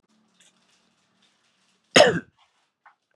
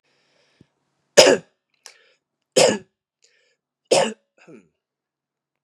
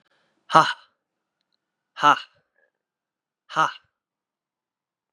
{"cough_length": "3.2 s", "cough_amplitude": 28950, "cough_signal_mean_std_ratio": 0.2, "three_cough_length": "5.6 s", "three_cough_amplitude": 32768, "three_cough_signal_mean_std_ratio": 0.24, "exhalation_length": "5.1 s", "exhalation_amplitude": 32768, "exhalation_signal_mean_std_ratio": 0.21, "survey_phase": "beta (2021-08-13 to 2022-03-07)", "age": "18-44", "gender": "Male", "wearing_mask": "No", "symptom_cough_any": true, "symptom_runny_or_blocked_nose": true, "symptom_sore_throat": true, "symptom_fatigue": true, "symptom_headache": true, "symptom_onset": "3 days", "smoker_status": "Never smoked", "respiratory_condition_asthma": false, "respiratory_condition_other": false, "recruitment_source": "Test and Trace", "submission_delay": "2 days", "covid_test_result": "Positive", "covid_test_method": "RT-qPCR", "covid_ct_value": 27.2, "covid_ct_gene": "N gene"}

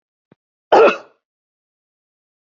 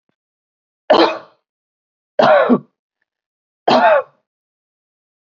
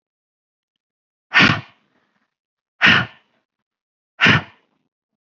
{"cough_length": "2.6 s", "cough_amplitude": 27671, "cough_signal_mean_std_ratio": 0.24, "three_cough_length": "5.4 s", "three_cough_amplitude": 30027, "three_cough_signal_mean_std_ratio": 0.35, "exhalation_length": "5.4 s", "exhalation_amplitude": 29392, "exhalation_signal_mean_std_ratio": 0.28, "survey_phase": "alpha (2021-03-01 to 2021-08-12)", "age": "45-64", "gender": "Female", "wearing_mask": "No", "symptom_none": true, "smoker_status": "Ex-smoker", "respiratory_condition_asthma": false, "respiratory_condition_other": false, "recruitment_source": "REACT", "submission_delay": "3 days", "covid_test_result": "Negative", "covid_test_method": "RT-qPCR"}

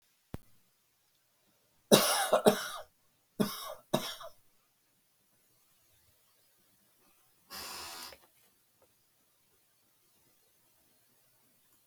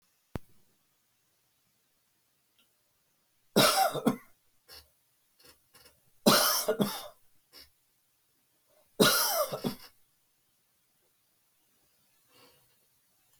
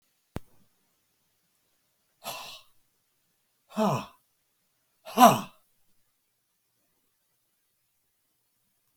{"cough_length": "11.9 s", "cough_amplitude": 19103, "cough_signal_mean_std_ratio": 0.23, "three_cough_length": "13.4 s", "three_cough_amplitude": 14231, "three_cough_signal_mean_std_ratio": 0.29, "exhalation_length": "9.0 s", "exhalation_amplitude": 23812, "exhalation_signal_mean_std_ratio": 0.17, "survey_phase": "beta (2021-08-13 to 2022-03-07)", "age": "65+", "gender": "Male", "wearing_mask": "No", "symptom_none": true, "smoker_status": "Never smoked", "respiratory_condition_asthma": false, "respiratory_condition_other": false, "recruitment_source": "REACT", "submission_delay": "2 days", "covid_test_result": "Negative", "covid_test_method": "RT-qPCR", "influenza_a_test_result": "Negative", "influenza_b_test_result": "Negative"}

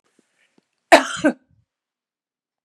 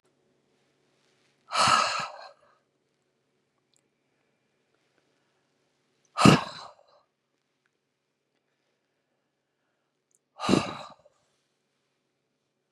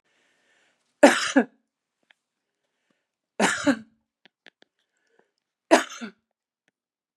{"cough_length": "2.6 s", "cough_amplitude": 32768, "cough_signal_mean_std_ratio": 0.21, "exhalation_length": "12.7 s", "exhalation_amplitude": 26976, "exhalation_signal_mean_std_ratio": 0.2, "three_cough_length": "7.2 s", "three_cough_amplitude": 32406, "three_cough_signal_mean_std_ratio": 0.22, "survey_phase": "beta (2021-08-13 to 2022-03-07)", "age": "65+", "gender": "Female", "wearing_mask": "No", "symptom_shortness_of_breath": true, "symptom_fatigue": true, "symptom_onset": "12 days", "smoker_status": "Ex-smoker", "respiratory_condition_asthma": false, "respiratory_condition_other": false, "recruitment_source": "REACT", "submission_delay": "2 days", "covid_test_result": "Negative", "covid_test_method": "RT-qPCR", "influenza_a_test_result": "Negative", "influenza_b_test_result": "Negative"}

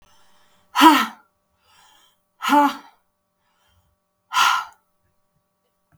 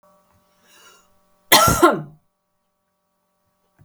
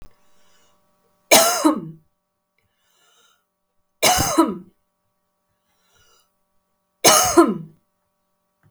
{"exhalation_length": "6.0 s", "exhalation_amplitude": 32768, "exhalation_signal_mean_std_ratio": 0.3, "cough_length": "3.8 s", "cough_amplitude": 32768, "cough_signal_mean_std_ratio": 0.27, "three_cough_length": "8.7 s", "three_cough_amplitude": 32768, "three_cough_signal_mean_std_ratio": 0.32, "survey_phase": "beta (2021-08-13 to 2022-03-07)", "age": "18-44", "gender": "Female", "wearing_mask": "No", "symptom_runny_or_blocked_nose": true, "symptom_onset": "2 days", "smoker_status": "Never smoked", "respiratory_condition_asthma": true, "respiratory_condition_other": false, "recruitment_source": "REACT", "submission_delay": "1 day", "covid_test_result": "Negative", "covid_test_method": "RT-qPCR"}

